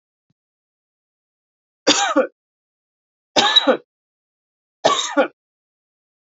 three_cough_length: 6.2 s
three_cough_amplitude: 32767
three_cough_signal_mean_std_ratio: 0.31
survey_phase: beta (2021-08-13 to 2022-03-07)
age: 18-44
gender: Female
wearing_mask: 'No'
symptom_none: true
symptom_onset: 4 days
smoker_status: Never smoked
respiratory_condition_asthma: false
respiratory_condition_other: false
recruitment_source: Test and Trace
submission_delay: 2 days
covid_test_result: Positive
covid_test_method: RT-qPCR
covid_ct_value: 20.6
covid_ct_gene: N gene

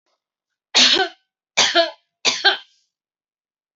three_cough_length: 3.8 s
three_cough_amplitude: 29517
three_cough_signal_mean_std_ratio: 0.37
survey_phase: alpha (2021-03-01 to 2021-08-12)
age: 45-64
gender: Female
wearing_mask: 'No'
symptom_none: true
smoker_status: Current smoker (1 to 10 cigarettes per day)
respiratory_condition_asthma: true
respiratory_condition_other: false
recruitment_source: REACT
submission_delay: 1 day
covid_test_result: Negative
covid_test_method: RT-qPCR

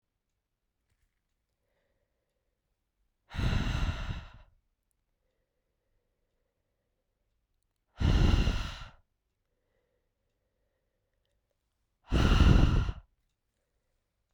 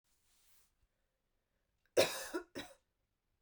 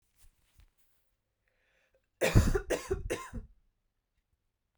exhalation_length: 14.3 s
exhalation_amplitude: 11709
exhalation_signal_mean_std_ratio: 0.3
cough_length: 3.4 s
cough_amplitude: 5242
cough_signal_mean_std_ratio: 0.23
three_cough_length: 4.8 s
three_cough_amplitude: 10430
three_cough_signal_mean_std_ratio: 0.29
survey_phase: beta (2021-08-13 to 2022-03-07)
age: 18-44
gender: Female
wearing_mask: 'No'
symptom_runny_or_blocked_nose: true
symptom_fatigue: true
symptom_headache: true
smoker_status: Never smoked
respiratory_condition_asthma: false
respiratory_condition_other: false
recruitment_source: Test and Trace
submission_delay: 1 day
covid_test_result: Positive
covid_test_method: LFT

